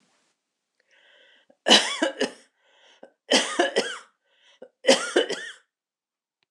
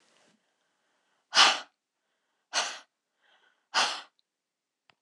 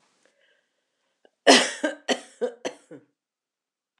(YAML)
three_cough_length: 6.5 s
three_cough_amplitude: 25850
three_cough_signal_mean_std_ratio: 0.34
exhalation_length: 5.0 s
exhalation_amplitude: 17132
exhalation_signal_mean_std_ratio: 0.25
cough_length: 4.0 s
cough_amplitude: 25828
cough_signal_mean_std_ratio: 0.25
survey_phase: beta (2021-08-13 to 2022-03-07)
age: 45-64
gender: Female
wearing_mask: 'No'
symptom_none: true
smoker_status: Ex-smoker
respiratory_condition_asthma: false
respiratory_condition_other: false
recruitment_source: REACT
submission_delay: 1 day
covid_test_result: Negative
covid_test_method: RT-qPCR